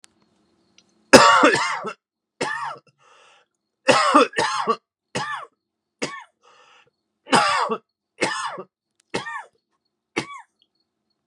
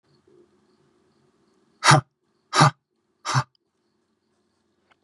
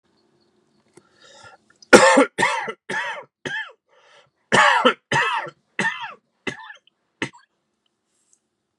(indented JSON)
{
  "three_cough_length": "11.3 s",
  "three_cough_amplitude": 32768,
  "three_cough_signal_mean_std_ratio": 0.35,
  "exhalation_length": "5.0 s",
  "exhalation_amplitude": 29710,
  "exhalation_signal_mean_std_ratio": 0.23,
  "cough_length": "8.8 s",
  "cough_amplitude": 32768,
  "cough_signal_mean_std_ratio": 0.34,
  "survey_phase": "beta (2021-08-13 to 2022-03-07)",
  "age": "45-64",
  "gender": "Male",
  "wearing_mask": "No",
  "symptom_cough_any": true,
  "symptom_new_continuous_cough": true,
  "symptom_runny_or_blocked_nose": true,
  "symptom_sore_throat": true,
  "symptom_fatigue": true,
  "symptom_headache": true,
  "symptom_onset": "9 days",
  "smoker_status": "Never smoked",
  "respiratory_condition_asthma": false,
  "respiratory_condition_other": false,
  "recruitment_source": "Test and Trace",
  "submission_delay": "1 day",
  "covid_test_result": "Positive",
  "covid_test_method": "ePCR"
}